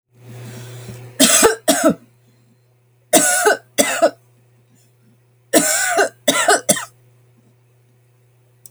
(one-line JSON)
{"three_cough_length": "8.7 s", "three_cough_amplitude": 32768, "three_cough_signal_mean_std_ratio": 0.43, "survey_phase": "alpha (2021-03-01 to 2021-08-12)", "age": "45-64", "gender": "Female", "wearing_mask": "No", "symptom_shortness_of_breath": true, "symptom_fatigue": true, "symptom_headache": true, "smoker_status": "Never smoked", "respiratory_condition_asthma": false, "respiratory_condition_other": false, "recruitment_source": "REACT", "submission_delay": "1 day", "covid_test_result": "Negative", "covid_test_method": "RT-qPCR"}